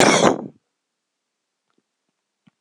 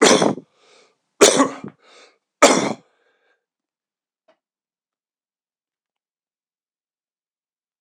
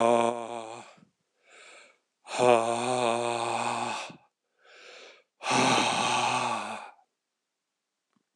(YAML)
cough_length: 2.6 s
cough_amplitude: 26028
cough_signal_mean_std_ratio: 0.3
three_cough_length: 7.8 s
three_cough_amplitude: 26028
three_cough_signal_mean_std_ratio: 0.25
exhalation_length: 8.4 s
exhalation_amplitude: 14195
exhalation_signal_mean_std_ratio: 0.51
survey_phase: alpha (2021-03-01 to 2021-08-12)
age: 45-64
gender: Male
wearing_mask: 'No'
symptom_cough_any: true
smoker_status: Never smoked
respiratory_condition_asthma: true
respiratory_condition_other: false
recruitment_source: REACT
submission_delay: 1 day
covid_test_result: Negative
covid_test_method: RT-qPCR